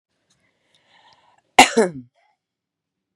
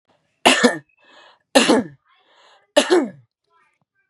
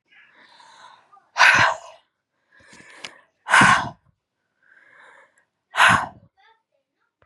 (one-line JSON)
{"cough_length": "3.2 s", "cough_amplitude": 32768, "cough_signal_mean_std_ratio": 0.19, "three_cough_length": "4.1 s", "three_cough_amplitude": 32768, "three_cough_signal_mean_std_ratio": 0.35, "exhalation_length": "7.3 s", "exhalation_amplitude": 29941, "exhalation_signal_mean_std_ratio": 0.31, "survey_phase": "beta (2021-08-13 to 2022-03-07)", "age": "18-44", "gender": "Female", "wearing_mask": "No", "symptom_sore_throat": true, "symptom_onset": "3 days", "smoker_status": "Ex-smoker", "respiratory_condition_asthma": false, "respiratory_condition_other": false, "recruitment_source": "Test and Trace", "submission_delay": "1 day", "covid_test_result": "Positive", "covid_test_method": "RT-qPCR", "covid_ct_value": 20.2, "covid_ct_gene": "ORF1ab gene", "covid_ct_mean": 20.7, "covid_viral_load": "160000 copies/ml", "covid_viral_load_category": "Low viral load (10K-1M copies/ml)"}